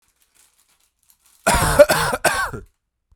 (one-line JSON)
{"cough_length": "3.2 s", "cough_amplitude": 32768, "cough_signal_mean_std_ratio": 0.39, "survey_phase": "alpha (2021-03-01 to 2021-08-12)", "age": "18-44", "gender": "Male", "wearing_mask": "No", "symptom_cough_any": true, "symptom_fatigue": true, "symptom_fever_high_temperature": true, "symptom_headache": true, "symptom_onset": "3 days", "smoker_status": "Ex-smoker", "respiratory_condition_asthma": false, "respiratory_condition_other": false, "recruitment_source": "Test and Trace", "submission_delay": "1 day", "covid_test_result": "Positive", "covid_test_method": "RT-qPCR", "covid_ct_value": 18.3, "covid_ct_gene": "ORF1ab gene", "covid_ct_mean": 19.1, "covid_viral_load": "560000 copies/ml", "covid_viral_load_category": "Low viral load (10K-1M copies/ml)"}